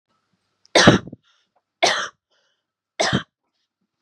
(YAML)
three_cough_length: 4.0 s
three_cough_amplitude: 32768
three_cough_signal_mean_std_ratio: 0.29
survey_phase: beta (2021-08-13 to 2022-03-07)
age: 18-44
gender: Female
wearing_mask: 'No'
symptom_none: true
symptom_onset: 13 days
smoker_status: Never smoked
respiratory_condition_asthma: false
respiratory_condition_other: false
recruitment_source: REACT
submission_delay: 2 days
covid_test_result: Negative
covid_test_method: RT-qPCR
influenza_a_test_result: Negative
influenza_b_test_result: Negative